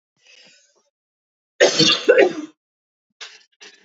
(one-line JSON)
{"cough_length": "3.8 s", "cough_amplitude": 28392, "cough_signal_mean_std_ratio": 0.33, "survey_phase": "beta (2021-08-13 to 2022-03-07)", "age": "45-64", "gender": "Female", "wearing_mask": "No", "symptom_cough_any": true, "symptom_runny_or_blocked_nose": true, "symptom_sore_throat": true, "symptom_abdominal_pain": true, "symptom_diarrhoea": true, "symptom_fatigue": true, "symptom_headache": true, "symptom_change_to_sense_of_smell_or_taste": true, "smoker_status": "Current smoker (e-cigarettes or vapes only)", "respiratory_condition_asthma": false, "respiratory_condition_other": false, "recruitment_source": "Test and Trace", "submission_delay": "1 day", "covid_test_result": "Positive", "covid_test_method": "RT-qPCR", "covid_ct_value": 20.2, "covid_ct_gene": "N gene", "covid_ct_mean": 21.2, "covid_viral_load": "110000 copies/ml", "covid_viral_load_category": "Low viral load (10K-1M copies/ml)"}